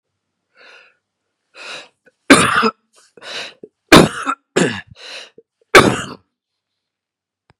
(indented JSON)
{
  "three_cough_length": "7.6 s",
  "three_cough_amplitude": 32768,
  "three_cough_signal_mean_std_ratio": 0.29,
  "survey_phase": "beta (2021-08-13 to 2022-03-07)",
  "age": "45-64",
  "gender": "Male",
  "wearing_mask": "No",
  "symptom_cough_any": true,
  "smoker_status": "Never smoked",
  "respiratory_condition_asthma": false,
  "respiratory_condition_other": false,
  "recruitment_source": "REACT",
  "submission_delay": "1 day",
  "covid_test_result": "Negative",
  "covid_test_method": "RT-qPCR"
}